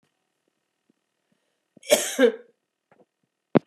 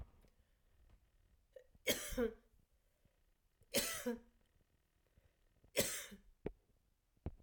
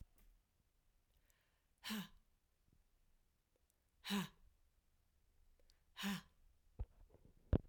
{"cough_length": "3.7 s", "cough_amplitude": 26769, "cough_signal_mean_std_ratio": 0.23, "three_cough_length": "7.4 s", "three_cough_amplitude": 2894, "three_cough_signal_mean_std_ratio": 0.33, "exhalation_length": "7.7 s", "exhalation_amplitude": 3312, "exhalation_signal_mean_std_ratio": 0.26, "survey_phase": "alpha (2021-03-01 to 2021-08-12)", "age": "45-64", "gender": "Female", "wearing_mask": "No", "symptom_none": true, "smoker_status": "Never smoked", "respiratory_condition_asthma": true, "respiratory_condition_other": false, "recruitment_source": "REACT", "submission_delay": "1 day", "covid_test_result": "Negative", "covid_test_method": "RT-qPCR"}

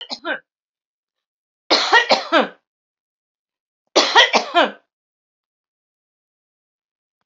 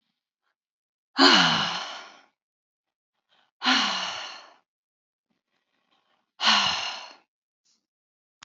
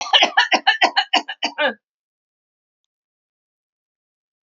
{"three_cough_length": "7.3 s", "three_cough_amplitude": 32767, "three_cough_signal_mean_std_ratio": 0.31, "exhalation_length": "8.4 s", "exhalation_amplitude": 25256, "exhalation_signal_mean_std_ratio": 0.34, "cough_length": "4.4 s", "cough_amplitude": 29397, "cough_signal_mean_std_ratio": 0.35, "survey_phase": "alpha (2021-03-01 to 2021-08-12)", "age": "65+", "gender": "Female", "wearing_mask": "No", "symptom_none": true, "smoker_status": "Never smoked", "respiratory_condition_asthma": false, "respiratory_condition_other": false, "recruitment_source": "REACT", "submission_delay": "1 day", "covid_test_result": "Negative", "covid_test_method": "RT-qPCR"}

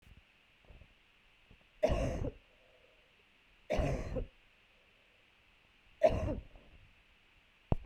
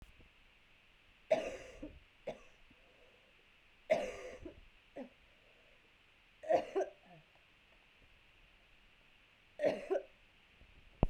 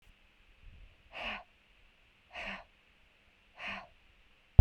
{"three_cough_length": "7.9 s", "three_cough_amplitude": 7665, "three_cough_signal_mean_std_ratio": 0.35, "cough_length": "11.1 s", "cough_amplitude": 9033, "cough_signal_mean_std_ratio": 0.31, "exhalation_length": "4.6 s", "exhalation_amplitude": 16353, "exhalation_signal_mean_std_ratio": 0.14, "survey_phase": "beta (2021-08-13 to 2022-03-07)", "age": "18-44", "gender": "Female", "wearing_mask": "No", "symptom_cough_any": true, "symptom_new_continuous_cough": true, "symptom_shortness_of_breath": true, "symptom_headache": true, "symptom_onset": "2 days", "smoker_status": "Never smoked", "respiratory_condition_asthma": false, "respiratory_condition_other": false, "recruitment_source": "Test and Trace", "submission_delay": "1 day", "covid_test_result": "Negative", "covid_test_method": "RT-qPCR"}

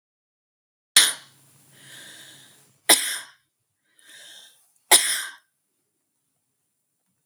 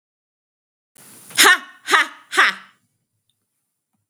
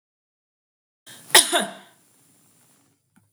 {"three_cough_length": "7.3 s", "three_cough_amplitude": 32768, "three_cough_signal_mean_std_ratio": 0.23, "exhalation_length": "4.1 s", "exhalation_amplitude": 32768, "exhalation_signal_mean_std_ratio": 0.29, "cough_length": "3.3 s", "cough_amplitude": 32768, "cough_signal_mean_std_ratio": 0.21, "survey_phase": "beta (2021-08-13 to 2022-03-07)", "age": "45-64", "gender": "Female", "wearing_mask": "No", "symptom_none": true, "symptom_onset": "9 days", "smoker_status": "Ex-smoker", "respiratory_condition_asthma": false, "respiratory_condition_other": false, "recruitment_source": "REACT", "submission_delay": "0 days", "covid_test_result": "Negative", "covid_test_method": "RT-qPCR", "influenza_a_test_result": "Unknown/Void", "influenza_b_test_result": "Unknown/Void"}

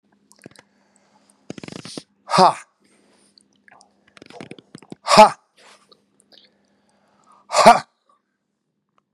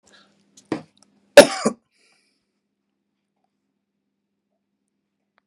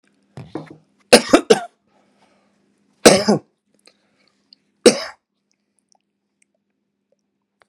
{"exhalation_length": "9.1 s", "exhalation_amplitude": 32768, "exhalation_signal_mean_std_ratio": 0.21, "cough_length": "5.5 s", "cough_amplitude": 32768, "cough_signal_mean_std_ratio": 0.13, "three_cough_length": "7.7 s", "three_cough_amplitude": 32768, "three_cough_signal_mean_std_ratio": 0.22, "survey_phase": "beta (2021-08-13 to 2022-03-07)", "age": "65+", "gender": "Male", "wearing_mask": "No", "symptom_none": true, "smoker_status": "Ex-smoker", "respiratory_condition_asthma": false, "respiratory_condition_other": false, "recruitment_source": "REACT", "submission_delay": "2 days", "covid_test_result": "Negative", "covid_test_method": "RT-qPCR", "influenza_a_test_result": "Negative", "influenza_b_test_result": "Negative"}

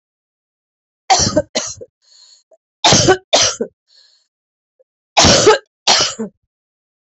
{"three_cough_length": "7.1 s", "three_cough_amplitude": 32768, "three_cough_signal_mean_std_ratio": 0.4, "survey_phase": "beta (2021-08-13 to 2022-03-07)", "age": "45-64", "gender": "Female", "wearing_mask": "No", "symptom_cough_any": true, "symptom_runny_or_blocked_nose": true, "symptom_shortness_of_breath": true, "symptom_sore_throat": true, "symptom_fatigue": true, "symptom_headache": true, "symptom_change_to_sense_of_smell_or_taste": true, "smoker_status": "Ex-smoker", "respiratory_condition_asthma": false, "respiratory_condition_other": false, "recruitment_source": "Test and Trace", "submission_delay": "2 days", "covid_test_result": "Positive", "covid_test_method": "LFT"}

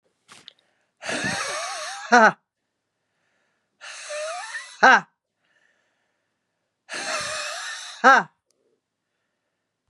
{"exhalation_length": "9.9 s", "exhalation_amplitude": 28807, "exhalation_signal_mean_std_ratio": 0.3, "survey_phase": "beta (2021-08-13 to 2022-03-07)", "age": "45-64", "gender": "Female", "wearing_mask": "No", "symptom_cough_any": true, "symptom_runny_or_blocked_nose": true, "symptom_fatigue": true, "symptom_headache": true, "symptom_onset": "4 days", "smoker_status": "Current smoker (e-cigarettes or vapes only)", "respiratory_condition_asthma": false, "respiratory_condition_other": false, "recruitment_source": "Test and Trace", "submission_delay": "1 day", "covid_test_result": "Positive", "covid_test_method": "RT-qPCR", "covid_ct_value": 27.7, "covid_ct_gene": "ORF1ab gene"}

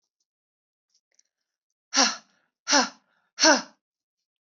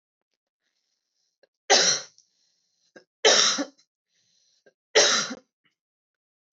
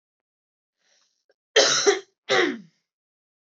{"exhalation_length": "4.4 s", "exhalation_amplitude": 18844, "exhalation_signal_mean_std_ratio": 0.27, "three_cough_length": "6.6 s", "three_cough_amplitude": 19271, "three_cough_signal_mean_std_ratio": 0.31, "cough_length": "3.4 s", "cough_amplitude": 18719, "cough_signal_mean_std_ratio": 0.35, "survey_phase": "beta (2021-08-13 to 2022-03-07)", "age": "18-44", "gender": "Female", "wearing_mask": "No", "symptom_cough_any": true, "symptom_runny_or_blocked_nose": true, "symptom_onset": "2 days", "smoker_status": "Never smoked", "respiratory_condition_asthma": false, "respiratory_condition_other": false, "recruitment_source": "Test and Trace", "submission_delay": "1 day", "covid_test_result": "Positive", "covid_test_method": "RT-qPCR", "covid_ct_value": 25.9, "covid_ct_gene": "ORF1ab gene", "covid_ct_mean": 26.2, "covid_viral_load": "2600 copies/ml", "covid_viral_load_category": "Minimal viral load (< 10K copies/ml)"}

